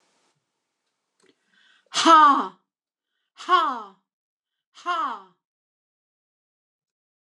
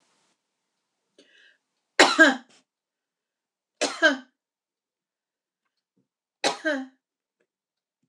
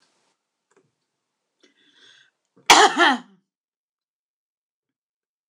{
  "exhalation_length": "7.2 s",
  "exhalation_amplitude": 23694,
  "exhalation_signal_mean_std_ratio": 0.28,
  "three_cough_length": "8.1 s",
  "three_cough_amplitude": 26027,
  "three_cough_signal_mean_std_ratio": 0.23,
  "cough_length": "5.5 s",
  "cough_amplitude": 26028,
  "cough_signal_mean_std_ratio": 0.21,
  "survey_phase": "beta (2021-08-13 to 2022-03-07)",
  "age": "65+",
  "gender": "Female",
  "wearing_mask": "No",
  "symptom_none": true,
  "smoker_status": "Ex-smoker",
  "respiratory_condition_asthma": false,
  "respiratory_condition_other": false,
  "recruitment_source": "REACT",
  "submission_delay": "1 day",
  "covid_test_result": "Negative",
  "covid_test_method": "RT-qPCR"
}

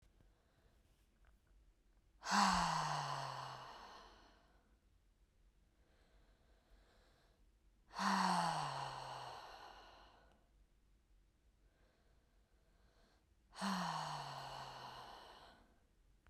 {
  "exhalation_length": "16.3 s",
  "exhalation_amplitude": 2957,
  "exhalation_signal_mean_std_ratio": 0.41,
  "survey_phase": "beta (2021-08-13 to 2022-03-07)",
  "age": "18-44",
  "gender": "Female",
  "wearing_mask": "No",
  "symptom_none": true,
  "smoker_status": "Never smoked",
  "respiratory_condition_asthma": true,
  "respiratory_condition_other": false,
  "recruitment_source": "REACT",
  "submission_delay": "2 days",
  "covid_test_result": "Negative",
  "covid_test_method": "RT-qPCR",
  "influenza_a_test_result": "Negative",
  "influenza_b_test_result": "Negative"
}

